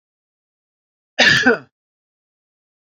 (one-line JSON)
{"cough_length": "2.8 s", "cough_amplitude": 31371, "cough_signal_mean_std_ratio": 0.29, "survey_phase": "beta (2021-08-13 to 2022-03-07)", "age": "45-64", "gender": "Male", "wearing_mask": "No", "symptom_none": true, "smoker_status": "Ex-smoker", "respiratory_condition_asthma": false, "respiratory_condition_other": false, "recruitment_source": "REACT", "submission_delay": "5 days", "covid_test_result": "Negative", "covid_test_method": "RT-qPCR", "influenza_a_test_result": "Negative", "influenza_b_test_result": "Negative"}